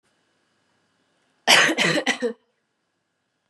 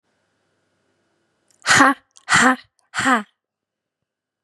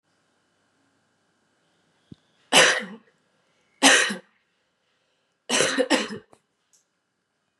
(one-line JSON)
{"cough_length": "3.5 s", "cough_amplitude": 31460, "cough_signal_mean_std_ratio": 0.34, "exhalation_length": "4.4 s", "exhalation_amplitude": 32197, "exhalation_signal_mean_std_ratio": 0.32, "three_cough_length": "7.6 s", "three_cough_amplitude": 31873, "three_cough_signal_mean_std_ratio": 0.29, "survey_phase": "beta (2021-08-13 to 2022-03-07)", "age": "18-44", "gender": "Female", "wearing_mask": "No", "symptom_cough_any": true, "symptom_runny_or_blocked_nose": true, "symptom_sore_throat": true, "symptom_diarrhoea": true, "symptom_fatigue": true, "symptom_fever_high_temperature": true, "smoker_status": "Never smoked", "respiratory_condition_asthma": false, "respiratory_condition_other": false, "recruitment_source": "Test and Trace", "submission_delay": "2 days", "covid_test_result": "Positive", "covid_test_method": "RT-qPCR", "covid_ct_value": 26.6, "covid_ct_gene": "ORF1ab gene"}